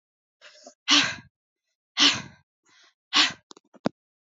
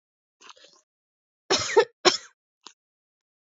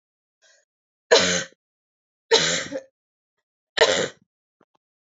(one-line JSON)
{"exhalation_length": "4.4 s", "exhalation_amplitude": 18885, "exhalation_signal_mean_std_ratio": 0.3, "cough_length": "3.6 s", "cough_amplitude": 28219, "cough_signal_mean_std_ratio": 0.24, "three_cough_length": "5.1 s", "three_cough_amplitude": 26896, "three_cough_signal_mean_std_ratio": 0.32, "survey_phase": "alpha (2021-03-01 to 2021-08-12)", "age": "18-44", "gender": "Female", "wearing_mask": "No", "symptom_shortness_of_breath": true, "symptom_change_to_sense_of_smell_or_taste": true, "symptom_loss_of_taste": true, "symptom_onset": "2 days", "smoker_status": "Never smoked", "respiratory_condition_asthma": false, "respiratory_condition_other": false, "recruitment_source": "Test and Trace", "submission_delay": "2 days", "covid_test_result": "Positive", "covid_test_method": "RT-qPCR", "covid_ct_value": 19.3, "covid_ct_gene": "ORF1ab gene", "covid_ct_mean": 19.8, "covid_viral_load": "320000 copies/ml", "covid_viral_load_category": "Low viral load (10K-1M copies/ml)"}